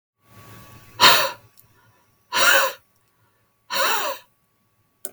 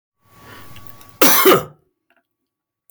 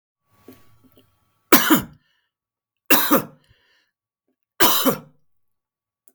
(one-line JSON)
{"exhalation_length": "5.1 s", "exhalation_amplitude": 32768, "exhalation_signal_mean_std_ratio": 0.37, "cough_length": "2.9 s", "cough_amplitude": 32768, "cough_signal_mean_std_ratio": 0.34, "three_cough_length": "6.1 s", "three_cough_amplitude": 32768, "three_cough_signal_mean_std_ratio": 0.3, "survey_phase": "beta (2021-08-13 to 2022-03-07)", "age": "45-64", "gender": "Male", "wearing_mask": "No", "symptom_none": true, "smoker_status": "Never smoked", "respiratory_condition_asthma": false, "respiratory_condition_other": false, "recruitment_source": "REACT", "submission_delay": "32 days", "covid_test_result": "Negative", "covid_test_method": "RT-qPCR", "influenza_a_test_result": "Negative", "influenza_b_test_result": "Negative"}